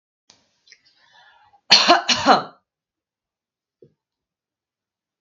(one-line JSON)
{"cough_length": "5.2 s", "cough_amplitude": 32767, "cough_signal_mean_std_ratio": 0.25, "survey_phase": "beta (2021-08-13 to 2022-03-07)", "age": "18-44", "gender": "Female", "wearing_mask": "No", "symptom_none": true, "smoker_status": "Never smoked", "respiratory_condition_asthma": false, "respiratory_condition_other": false, "recruitment_source": "REACT", "submission_delay": "4 days", "covid_test_result": "Negative", "covid_test_method": "RT-qPCR", "influenza_a_test_result": "Negative", "influenza_b_test_result": "Negative"}